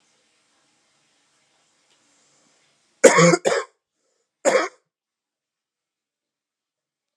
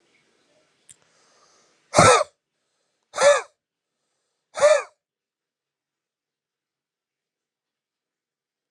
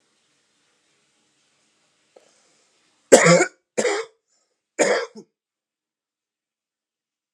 {"cough_length": "7.2 s", "cough_amplitude": 32768, "cough_signal_mean_std_ratio": 0.23, "exhalation_length": "8.7 s", "exhalation_amplitude": 29676, "exhalation_signal_mean_std_ratio": 0.23, "three_cough_length": "7.3 s", "three_cough_amplitude": 32768, "three_cough_signal_mean_std_ratio": 0.24, "survey_phase": "alpha (2021-03-01 to 2021-08-12)", "age": "18-44", "gender": "Male", "wearing_mask": "No", "symptom_cough_any": true, "smoker_status": "Never smoked", "respiratory_condition_asthma": true, "respiratory_condition_other": false, "recruitment_source": "Test and Trace", "submission_delay": "3 days", "covid_test_result": "Positive", "covid_test_method": "RT-qPCR", "covid_ct_value": 15.7, "covid_ct_gene": "ORF1ab gene", "covid_ct_mean": 15.9, "covid_viral_load": "6100000 copies/ml", "covid_viral_load_category": "High viral load (>1M copies/ml)"}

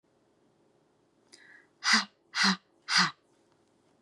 {"exhalation_length": "4.0 s", "exhalation_amplitude": 10088, "exhalation_signal_mean_std_ratio": 0.32, "survey_phase": "beta (2021-08-13 to 2022-03-07)", "age": "45-64", "gender": "Female", "wearing_mask": "No", "symptom_none": true, "smoker_status": "Never smoked", "respiratory_condition_asthma": false, "respiratory_condition_other": false, "recruitment_source": "REACT", "submission_delay": "1 day", "covid_test_result": "Negative", "covid_test_method": "RT-qPCR", "influenza_a_test_result": "Negative", "influenza_b_test_result": "Negative"}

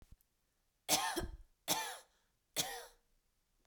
{"three_cough_length": "3.7 s", "three_cough_amplitude": 4203, "three_cough_signal_mean_std_ratio": 0.39, "survey_phase": "beta (2021-08-13 to 2022-03-07)", "age": "18-44", "gender": "Female", "wearing_mask": "No", "symptom_none": true, "smoker_status": "Never smoked", "respiratory_condition_asthma": false, "respiratory_condition_other": false, "recruitment_source": "REACT", "submission_delay": "1 day", "covid_test_result": "Negative", "covid_test_method": "RT-qPCR"}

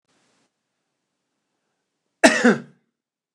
{"cough_length": "3.3 s", "cough_amplitude": 29204, "cough_signal_mean_std_ratio": 0.22, "survey_phase": "beta (2021-08-13 to 2022-03-07)", "age": "65+", "gender": "Male", "wearing_mask": "No", "symptom_none": true, "smoker_status": "Never smoked", "respiratory_condition_asthma": false, "respiratory_condition_other": false, "recruitment_source": "REACT", "submission_delay": "1 day", "covid_test_result": "Negative", "covid_test_method": "RT-qPCR"}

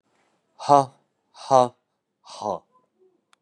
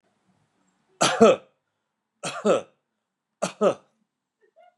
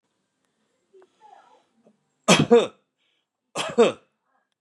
{"exhalation_length": "3.4 s", "exhalation_amplitude": 26878, "exhalation_signal_mean_std_ratio": 0.24, "three_cough_length": "4.8 s", "three_cough_amplitude": 26167, "three_cough_signal_mean_std_ratio": 0.29, "cough_length": "4.6 s", "cough_amplitude": 26429, "cough_signal_mean_std_ratio": 0.27, "survey_phase": "beta (2021-08-13 to 2022-03-07)", "age": "45-64", "gender": "Male", "wearing_mask": "No", "symptom_none": true, "smoker_status": "Ex-smoker", "respiratory_condition_asthma": false, "respiratory_condition_other": false, "recruitment_source": "REACT", "submission_delay": "7 days", "covid_test_result": "Negative", "covid_test_method": "RT-qPCR", "influenza_a_test_result": "Negative", "influenza_b_test_result": "Negative"}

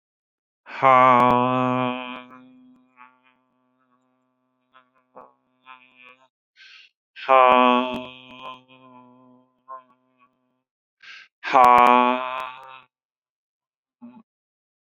{"exhalation_length": "14.8 s", "exhalation_amplitude": 28256, "exhalation_signal_mean_std_ratio": 0.3, "survey_phase": "beta (2021-08-13 to 2022-03-07)", "age": "45-64", "gender": "Male", "wearing_mask": "No", "symptom_none": true, "smoker_status": "Never smoked", "respiratory_condition_asthma": false, "respiratory_condition_other": false, "recruitment_source": "REACT", "submission_delay": "1 day", "covid_test_result": "Negative", "covid_test_method": "RT-qPCR"}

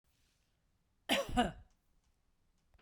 {"cough_length": "2.8 s", "cough_amplitude": 4095, "cough_signal_mean_std_ratio": 0.29, "survey_phase": "beta (2021-08-13 to 2022-03-07)", "age": "45-64", "gender": "Female", "wearing_mask": "No", "symptom_none": true, "smoker_status": "Never smoked", "respiratory_condition_asthma": false, "respiratory_condition_other": false, "recruitment_source": "REACT", "submission_delay": "1 day", "covid_test_result": "Negative", "covid_test_method": "RT-qPCR", "influenza_a_test_result": "Negative", "influenza_b_test_result": "Negative"}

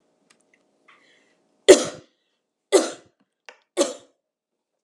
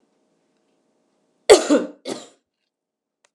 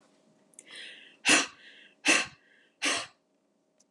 {"three_cough_length": "4.8 s", "three_cough_amplitude": 32768, "three_cough_signal_mean_std_ratio": 0.2, "cough_length": "3.3 s", "cough_amplitude": 32768, "cough_signal_mean_std_ratio": 0.22, "exhalation_length": "3.9 s", "exhalation_amplitude": 11857, "exhalation_signal_mean_std_ratio": 0.33, "survey_phase": "beta (2021-08-13 to 2022-03-07)", "age": "45-64", "gender": "Female", "wearing_mask": "No", "symptom_none": true, "smoker_status": "Never smoked", "respiratory_condition_asthma": false, "respiratory_condition_other": false, "recruitment_source": "REACT", "submission_delay": "2 days", "covid_test_result": "Negative", "covid_test_method": "RT-qPCR", "influenza_a_test_result": "Negative", "influenza_b_test_result": "Negative"}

